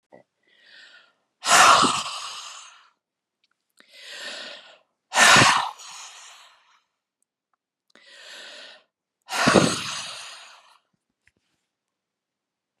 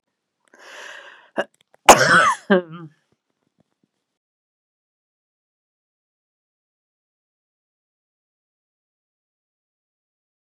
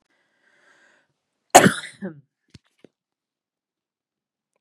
{"exhalation_length": "12.8 s", "exhalation_amplitude": 28016, "exhalation_signal_mean_std_ratio": 0.31, "cough_length": "10.5 s", "cough_amplitude": 32768, "cough_signal_mean_std_ratio": 0.18, "three_cough_length": "4.6 s", "three_cough_amplitude": 32768, "three_cough_signal_mean_std_ratio": 0.16, "survey_phase": "beta (2021-08-13 to 2022-03-07)", "age": "45-64", "gender": "Female", "wearing_mask": "No", "symptom_none": true, "smoker_status": "Never smoked", "respiratory_condition_asthma": false, "respiratory_condition_other": false, "recruitment_source": "REACT", "submission_delay": "2 days", "covid_test_result": "Negative", "covid_test_method": "RT-qPCR"}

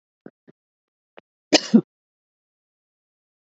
{"cough_length": "3.6 s", "cough_amplitude": 28637, "cough_signal_mean_std_ratio": 0.15, "survey_phase": "beta (2021-08-13 to 2022-03-07)", "age": "45-64", "gender": "Female", "wearing_mask": "No", "symptom_cough_any": true, "symptom_new_continuous_cough": true, "symptom_sore_throat": true, "symptom_abdominal_pain": true, "symptom_headache": true, "symptom_onset": "4 days", "smoker_status": "Never smoked", "respiratory_condition_asthma": false, "respiratory_condition_other": false, "recruitment_source": "Test and Trace", "submission_delay": "1 day", "covid_test_result": "Positive", "covid_test_method": "RT-qPCR"}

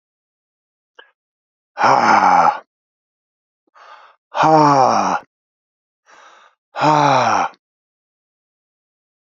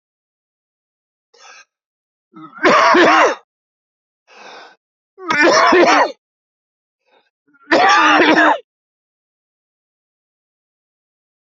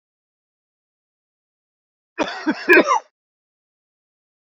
{"exhalation_length": "9.3 s", "exhalation_amplitude": 29701, "exhalation_signal_mean_std_ratio": 0.41, "three_cough_length": "11.4 s", "three_cough_amplitude": 32767, "three_cough_signal_mean_std_ratio": 0.4, "cough_length": "4.5 s", "cough_amplitude": 27199, "cough_signal_mean_std_ratio": 0.25, "survey_phase": "beta (2021-08-13 to 2022-03-07)", "age": "65+", "gender": "Male", "wearing_mask": "No", "symptom_cough_any": true, "symptom_runny_or_blocked_nose": true, "symptom_sore_throat": true, "symptom_fatigue": true, "symptom_onset": "4 days", "smoker_status": "Never smoked", "respiratory_condition_asthma": false, "respiratory_condition_other": false, "recruitment_source": "Test and Trace", "submission_delay": "3 days", "covid_test_result": "Positive", "covid_test_method": "RT-qPCR", "covid_ct_value": 15.1, "covid_ct_gene": "ORF1ab gene", "covid_ct_mean": 15.4, "covid_viral_load": "9000000 copies/ml", "covid_viral_load_category": "High viral load (>1M copies/ml)"}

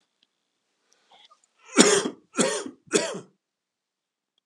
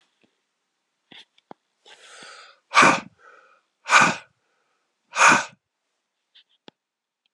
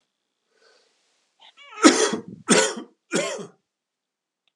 {"cough_length": "4.5 s", "cough_amplitude": 32219, "cough_signal_mean_std_ratio": 0.3, "exhalation_length": "7.3 s", "exhalation_amplitude": 27764, "exhalation_signal_mean_std_ratio": 0.26, "three_cough_length": "4.6 s", "three_cough_amplitude": 32548, "three_cough_signal_mean_std_ratio": 0.31, "survey_phase": "beta (2021-08-13 to 2022-03-07)", "age": "45-64", "gender": "Male", "wearing_mask": "No", "symptom_cough_any": true, "symptom_new_continuous_cough": true, "symptom_runny_or_blocked_nose": true, "symptom_headache": true, "symptom_other": true, "symptom_onset": "2 days", "smoker_status": "Never smoked", "respiratory_condition_asthma": false, "respiratory_condition_other": false, "recruitment_source": "Test and Trace", "submission_delay": "1 day", "covid_test_result": "Positive", "covid_test_method": "RT-qPCR", "covid_ct_value": 27.4, "covid_ct_gene": "ORF1ab gene"}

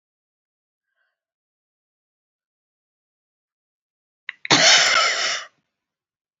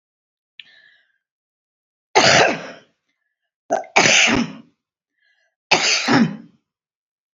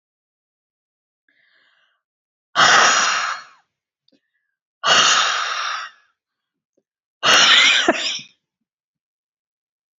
{"cough_length": "6.4 s", "cough_amplitude": 32618, "cough_signal_mean_std_ratio": 0.28, "three_cough_length": "7.3 s", "three_cough_amplitude": 32767, "three_cough_signal_mean_std_ratio": 0.38, "exhalation_length": "10.0 s", "exhalation_amplitude": 31068, "exhalation_signal_mean_std_ratio": 0.4, "survey_phase": "beta (2021-08-13 to 2022-03-07)", "age": "65+", "gender": "Female", "wearing_mask": "No", "symptom_cough_any": true, "smoker_status": "Never smoked", "respiratory_condition_asthma": false, "respiratory_condition_other": false, "recruitment_source": "REACT", "submission_delay": "1 day", "covid_test_result": "Negative", "covid_test_method": "RT-qPCR"}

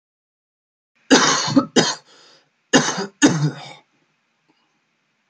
{"three_cough_length": "5.3 s", "three_cough_amplitude": 28463, "three_cough_signal_mean_std_ratio": 0.37, "survey_phase": "alpha (2021-03-01 to 2021-08-12)", "age": "18-44", "gender": "Male", "wearing_mask": "No", "symptom_cough_any": true, "symptom_onset": "2 days", "smoker_status": "Never smoked", "respiratory_condition_asthma": true, "respiratory_condition_other": false, "recruitment_source": "Test and Trace", "submission_delay": "1 day", "covid_test_result": "Positive", "covid_test_method": "RT-qPCR"}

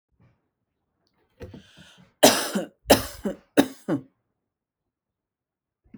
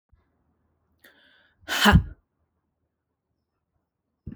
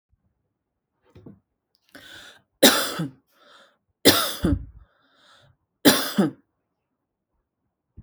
{"cough_length": "6.0 s", "cough_amplitude": 32767, "cough_signal_mean_std_ratio": 0.25, "exhalation_length": "4.4 s", "exhalation_amplitude": 19823, "exhalation_signal_mean_std_ratio": 0.21, "three_cough_length": "8.0 s", "three_cough_amplitude": 32768, "three_cough_signal_mean_std_ratio": 0.28, "survey_phase": "alpha (2021-03-01 to 2021-08-12)", "age": "18-44", "gender": "Female", "wearing_mask": "No", "symptom_headache": true, "smoker_status": "Never smoked", "respiratory_condition_asthma": false, "respiratory_condition_other": false, "recruitment_source": "Test and Trace", "submission_delay": "2 days", "covid_test_result": "Positive", "covid_test_method": "RT-qPCR", "covid_ct_value": 27.3, "covid_ct_gene": "N gene"}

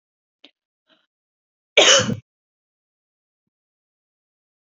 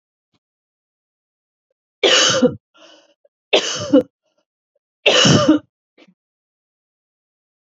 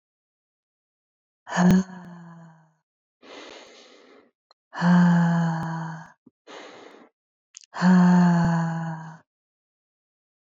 {"cough_length": "4.8 s", "cough_amplitude": 29875, "cough_signal_mean_std_ratio": 0.21, "three_cough_length": "7.8 s", "three_cough_amplitude": 29217, "three_cough_signal_mean_std_ratio": 0.34, "exhalation_length": "10.5 s", "exhalation_amplitude": 14232, "exhalation_signal_mean_std_ratio": 0.45, "survey_phase": "beta (2021-08-13 to 2022-03-07)", "age": "18-44", "gender": "Female", "wearing_mask": "No", "symptom_none": true, "smoker_status": "Never smoked", "respiratory_condition_asthma": false, "respiratory_condition_other": false, "recruitment_source": "REACT", "submission_delay": "1 day", "covid_test_result": "Negative", "covid_test_method": "RT-qPCR"}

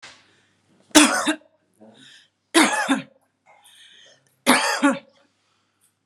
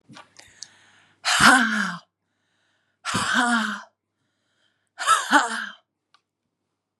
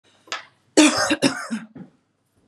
{"three_cough_length": "6.1 s", "three_cough_amplitude": 32768, "three_cough_signal_mean_std_ratio": 0.35, "exhalation_length": "7.0 s", "exhalation_amplitude": 27672, "exhalation_signal_mean_std_ratio": 0.4, "cough_length": "2.5 s", "cough_amplitude": 29020, "cough_signal_mean_std_ratio": 0.4, "survey_phase": "beta (2021-08-13 to 2022-03-07)", "age": "45-64", "gender": "Female", "wearing_mask": "No", "symptom_none": true, "smoker_status": "Never smoked", "respiratory_condition_asthma": false, "respiratory_condition_other": false, "recruitment_source": "REACT", "submission_delay": "1 day", "covid_test_result": "Negative", "covid_test_method": "RT-qPCR", "influenza_a_test_result": "Negative", "influenza_b_test_result": "Negative"}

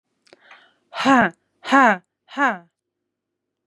{"exhalation_length": "3.7 s", "exhalation_amplitude": 29674, "exhalation_signal_mean_std_ratio": 0.32, "survey_phase": "beta (2021-08-13 to 2022-03-07)", "age": "45-64", "gender": "Female", "wearing_mask": "No", "symptom_none": true, "smoker_status": "Never smoked", "respiratory_condition_asthma": false, "respiratory_condition_other": false, "recruitment_source": "REACT", "submission_delay": "1 day", "covid_test_result": "Negative", "covid_test_method": "RT-qPCR", "influenza_a_test_result": "Negative", "influenza_b_test_result": "Negative"}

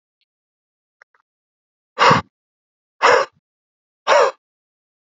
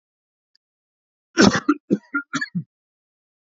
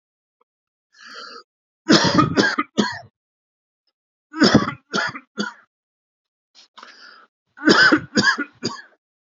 {"exhalation_length": "5.1 s", "exhalation_amplitude": 28824, "exhalation_signal_mean_std_ratio": 0.29, "cough_length": "3.6 s", "cough_amplitude": 28426, "cough_signal_mean_std_ratio": 0.28, "three_cough_length": "9.3 s", "three_cough_amplitude": 29039, "three_cough_signal_mean_std_ratio": 0.37, "survey_phase": "beta (2021-08-13 to 2022-03-07)", "age": "45-64", "gender": "Male", "wearing_mask": "No", "symptom_none": true, "smoker_status": "Never smoked", "respiratory_condition_asthma": false, "respiratory_condition_other": false, "recruitment_source": "REACT", "submission_delay": "1 day", "covid_test_result": "Negative", "covid_test_method": "RT-qPCR", "influenza_a_test_result": "Unknown/Void", "influenza_b_test_result": "Unknown/Void"}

